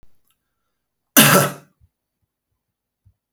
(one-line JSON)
{"cough_length": "3.3 s", "cough_amplitude": 32768, "cough_signal_mean_std_ratio": 0.25, "survey_phase": "alpha (2021-03-01 to 2021-08-12)", "age": "45-64", "gender": "Male", "wearing_mask": "No", "symptom_none": true, "smoker_status": "Current smoker (11 or more cigarettes per day)", "respiratory_condition_asthma": false, "respiratory_condition_other": false, "recruitment_source": "REACT", "submission_delay": "1 day", "covid_test_result": "Negative", "covid_test_method": "RT-qPCR"}